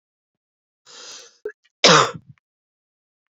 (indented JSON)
{
  "cough_length": "3.3 s",
  "cough_amplitude": 30117,
  "cough_signal_mean_std_ratio": 0.24,
  "survey_phase": "beta (2021-08-13 to 2022-03-07)",
  "age": "18-44",
  "gender": "Female",
  "wearing_mask": "No",
  "symptom_cough_any": true,
  "symptom_runny_or_blocked_nose": true,
  "symptom_fatigue": true,
  "symptom_fever_high_temperature": true,
  "symptom_headache": true,
  "smoker_status": "Ex-smoker",
  "respiratory_condition_asthma": false,
  "respiratory_condition_other": false,
  "recruitment_source": "Test and Trace",
  "submission_delay": "2 days",
  "covid_test_result": "Positive",
  "covid_test_method": "RT-qPCR",
  "covid_ct_value": 24.0,
  "covid_ct_gene": "ORF1ab gene",
  "covid_ct_mean": 24.7,
  "covid_viral_load": "8100 copies/ml",
  "covid_viral_load_category": "Minimal viral load (< 10K copies/ml)"
}